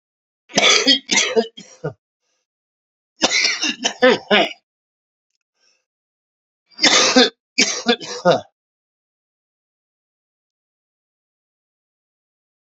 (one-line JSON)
{"three_cough_length": "12.7 s", "three_cough_amplitude": 32768, "three_cough_signal_mean_std_ratio": 0.35, "survey_phase": "beta (2021-08-13 to 2022-03-07)", "age": "45-64", "gender": "Male", "wearing_mask": "No", "symptom_cough_any": true, "symptom_runny_or_blocked_nose": true, "symptom_shortness_of_breath": true, "symptom_fatigue": true, "symptom_change_to_sense_of_smell_or_taste": true, "symptom_loss_of_taste": true, "symptom_onset": "5 days", "smoker_status": "Current smoker (11 or more cigarettes per day)", "respiratory_condition_asthma": false, "respiratory_condition_other": false, "recruitment_source": "Test and Trace", "submission_delay": "1 day", "covid_test_result": "Positive", "covid_test_method": "RT-qPCR", "covid_ct_value": 22.6, "covid_ct_gene": "ORF1ab gene", "covid_ct_mean": 23.5, "covid_viral_load": "20000 copies/ml", "covid_viral_load_category": "Low viral load (10K-1M copies/ml)"}